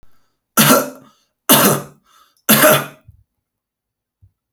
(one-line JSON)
{"three_cough_length": "4.5 s", "three_cough_amplitude": 32768, "three_cough_signal_mean_std_ratio": 0.38, "survey_phase": "alpha (2021-03-01 to 2021-08-12)", "age": "45-64", "gender": "Male", "wearing_mask": "No", "symptom_none": true, "smoker_status": "Current smoker (11 or more cigarettes per day)", "respiratory_condition_asthma": false, "respiratory_condition_other": false, "recruitment_source": "REACT", "submission_delay": "1 day", "covid_test_result": "Negative", "covid_test_method": "RT-qPCR"}